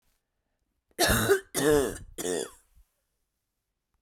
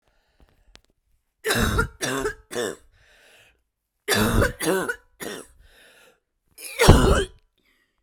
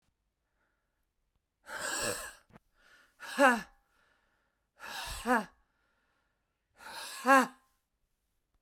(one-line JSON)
{"cough_length": "4.0 s", "cough_amplitude": 10259, "cough_signal_mean_std_ratio": 0.4, "three_cough_length": "8.0 s", "three_cough_amplitude": 32768, "three_cough_signal_mean_std_ratio": 0.38, "exhalation_length": "8.6 s", "exhalation_amplitude": 9641, "exhalation_signal_mean_std_ratio": 0.29, "survey_phase": "beta (2021-08-13 to 2022-03-07)", "age": "45-64", "gender": "Female", "wearing_mask": "No", "symptom_new_continuous_cough": true, "symptom_runny_or_blocked_nose": true, "symptom_shortness_of_breath": true, "symptom_sore_throat": true, "symptom_fatigue": true, "symptom_fever_high_temperature": true, "symptom_headache": true, "symptom_change_to_sense_of_smell_or_taste": true, "symptom_loss_of_taste": true, "symptom_onset": "4 days", "smoker_status": "Never smoked", "respiratory_condition_asthma": true, "respiratory_condition_other": false, "recruitment_source": "Test and Trace", "submission_delay": "2 days", "covid_test_result": "Positive", "covid_test_method": "RT-qPCR", "covid_ct_value": 14.3, "covid_ct_gene": "ORF1ab gene", "covid_ct_mean": 14.8, "covid_viral_load": "14000000 copies/ml", "covid_viral_load_category": "High viral load (>1M copies/ml)"}